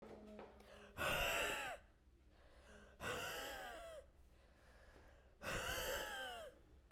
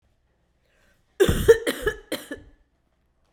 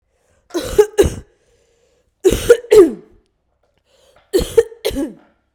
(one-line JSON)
{"exhalation_length": "6.9 s", "exhalation_amplitude": 1384, "exhalation_signal_mean_std_ratio": 0.64, "cough_length": "3.3 s", "cough_amplitude": 24959, "cough_signal_mean_std_ratio": 0.3, "three_cough_length": "5.5 s", "three_cough_amplitude": 32768, "three_cough_signal_mean_std_ratio": 0.35, "survey_phase": "beta (2021-08-13 to 2022-03-07)", "age": "18-44", "gender": "Female", "wearing_mask": "No", "symptom_cough_any": true, "symptom_abdominal_pain": true, "symptom_fatigue": true, "symptom_headache": true, "smoker_status": "Ex-smoker", "respiratory_condition_asthma": false, "respiratory_condition_other": false, "recruitment_source": "Test and Trace", "submission_delay": "2 days", "covid_test_result": "Positive", "covid_test_method": "RT-qPCR", "covid_ct_value": 27.8, "covid_ct_gene": "ORF1ab gene"}